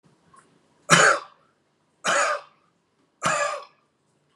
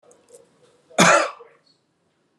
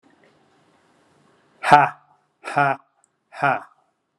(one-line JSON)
{"three_cough_length": "4.4 s", "three_cough_amplitude": 32590, "three_cough_signal_mean_std_ratio": 0.36, "cough_length": "2.4 s", "cough_amplitude": 25805, "cough_signal_mean_std_ratio": 0.3, "exhalation_length": "4.2 s", "exhalation_amplitude": 32768, "exhalation_signal_mean_std_ratio": 0.27, "survey_phase": "alpha (2021-03-01 to 2021-08-12)", "age": "45-64", "gender": "Male", "wearing_mask": "No", "symptom_none": true, "smoker_status": "Never smoked", "respiratory_condition_asthma": false, "respiratory_condition_other": false, "recruitment_source": "REACT", "submission_delay": "1 day", "covid_test_result": "Negative", "covid_test_method": "RT-qPCR"}